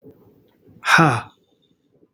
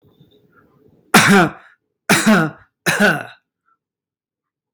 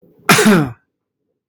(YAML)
exhalation_length: 2.1 s
exhalation_amplitude: 32767
exhalation_signal_mean_std_ratio: 0.32
three_cough_length: 4.7 s
three_cough_amplitude: 32767
three_cough_signal_mean_std_ratio: 0.4
cough_length: 1.5 s
cough_amplitude: 32768
cough_signal_mean_std_ratio: 0.44
survey_phase: beta (2021-08-13 to 2022-03-07)
age: 45-64
gender: Male
wearing_mask: 'No'
symptom_none: true
smoker_status: Ex-smoker
respiratory_condition_asthma: false
respiratory_condition_other: false
recruitment_source: REACT
submission_delay: 2 days
covid_test_result: Negative
covid_test_method: RT-qPCR